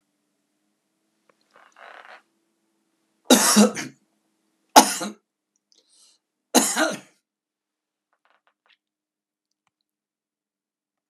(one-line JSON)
{"three_cough_length": "11.1 s", "three_cough_amplitude": 32768, "three_cough_signal_mean_std_ratio": 0.22, "survey_phase": "beta (2021-08-13 to 2022-03-07)", "age": "65+", "gender": "Male", "wearing_mask": "No", "symptom_runny_or_blocked_nose": true, "symptom_onset": "2 days", "smoker_status": "Never smoked", "respiratory_condition_asthma": false, "respiratory_condition_other": false, "recruitment_source": "Test and Trace", "submission_delay": "1 day", "covid_test_result": "Positive", "covid_test_method": "RT-qPCR", "covid_ct_value": 25.3, "covid_ct_gene": "ORF1ab gene", "covid_ct_mean": 26.1, "covid_viral_load": "2800 copies/ml", "covid_viral_load_category": "Minimal viral load (< 10K copies/ml)"}